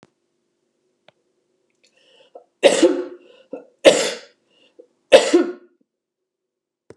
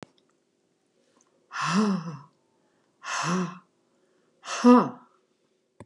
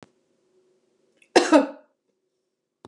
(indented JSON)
{
  "three_cough_length": "7.0 s",
  "three_cough_amplitude": 32768,
  "three_cough_signal_mean_std_ratio": 0.27,
  "exhalation_length": "5.9 s",
  "exhalation_amplitude": 18542,
  "exhalation_signal_mean_std_ratio": 0.33,
  "cough_length": "2.9 s",
  "cough_amplitude": 30694,
  "cough_signal_mean_std_ratio": 0.23,
  "survey_phase": "beta (2021-08-13 to 2022-03-07)",
  "age": "65+",
  "gender": "Female",
  "wearing_mask": "No",
  "symptom_none": true,
  "smoker_status": "Never smoked",
  "respiratory_condition_asthma": false,
  "respiratory_condition_other": false,
  "recruitment_source": "REACT",
  "submission_delay": "2 days",
  "covid_test_result": "Negative",
  "covid_test_method": "RT-qPCR",
  "influenza_a_test_result": "Negative",
  "influenza_b_test_result": "Negative"
}